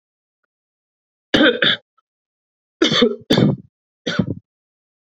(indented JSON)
{
  "three_cough_length": "5.0 s",
  "three_cough_amplitude": 28252,
  "three_cough_signal_mean_std_ratio": 0.38,
  "survey_phase": "beta (2021-08-13 to 2022-03-07)",
  "age": "18-44",
  "gender": "Male",
  "wearing_mask": "No",
  "symptom_cough_any": true,
  "symptom_new_continuous_cough": true,
  "symptom_runny_or_blocked_nose": true,
  "symptom_fatigue": true,
  "symptom_fever_high_temperature": true,
  "symptom_headache": true,
  "symptom_other": true,
  "smoker_status": "Ex-smoker",
  "respiratory_condition_asthma": false,
  "respiratory_condition_other": false,
  "recruitment_source": "Test and Trace",
  "submission_delay": "2 days",
  "covid_test_result": "Positive",
  "covid_test_method": "RT-qPCR",
  "covid_ct_value": 23.7,
  "covid_ct_gene": "N gene"
}